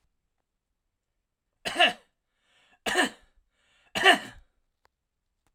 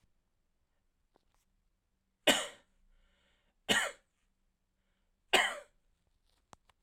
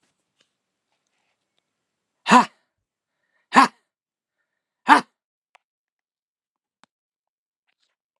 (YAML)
three_cough_length: 5.5 s
three_cough_amplitude: 16552
three_cough_signal_mean_std_ratio: 0.25
cough_length: 6.8 s
cough_amplitude: 9981
cough_signal_mean_std_ratio: 0.22
exhalation_length: 8.2 s
exhalation_amplitude: 32767
exhalation_signal_mean_std_ratio: 0.16
survey_phase: alpha (2021-03-01 to 2021-08-12)
age: 65+
gender: Male
wearing_mask: 'No'
symptom_none: true
smoker_status: Ex-smoker
respiratory_condition_asthma: false
respiratory_condition_other: false
recruitment_source: REACT
submission_delay: 1 day
covid_test_result: Negative
covid_test_method: RT-qPCR